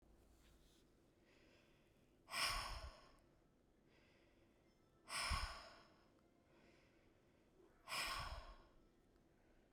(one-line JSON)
{"exhalation_length": "9.7 s", "exhalation_amplitude": 1147, "exhalation_signal_mean_std_ratio": 0.41, "survey_phase": "beta (2021-08-13 to 2022-03-07)", "age": "18-44", "gender": "Female", "wearing_mask": "No", "symptom_cough_any": true, "symptom_runny_or_blocked_nose": true, "symptom_sore_throat": true, "symptom_headache": true, "symptom_onset": "4 days", "smoker_status": "Ex-smoker", "respiratory_condition_asthma": false, "respiratory_condition_other": false, "recruitment_source": "Test and Trace", "submission_delay": "2 days", "covid_test_result": "Positive", "covid_test_method": "RT-qPCR", "covid_ct_value": 20.5, "covid_ct_gene": "N gene"}